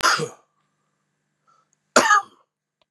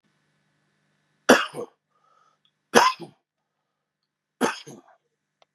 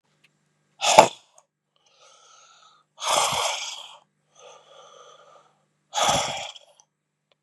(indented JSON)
{
  "cough_length": "2.9 s",
  "cough_amplitude": 32400,
  "cough_signal_mean_std_ratio": 0.31,
  "three_cough_length": "5.5 s",
  "three_cough_amplitude": 32768,
  "three_cough_signal_mean_std_ratio": 0.22,
  "exhalation_length": "7.4 s",
  "exhalation_amplitude": 32768,
  "exhalation_signal_mean_std_ratio": 0.3,
  "survey_phase": "beta (2021-08-13 to 2022-03-07)",
  "age": "45-64",
  "gender": "Male",
  "wearing_mask": "No",
  "symptom_cough_any": true,
  "symptom_runny_or_blocked_nose": true,
  "symptom_headache": true,
  "symptom_onset": "6 days",
  "smoker_status": "Ex-smoker",
  "respiratory_condition_asthma": false,
  "respiratory_condition_other": false,
  "recruitment_source": "REACT",
  "submission_delay": "1 day",
  "covid_test_result": "Negative",
  "covid_test_method": "RT-qPCR"
}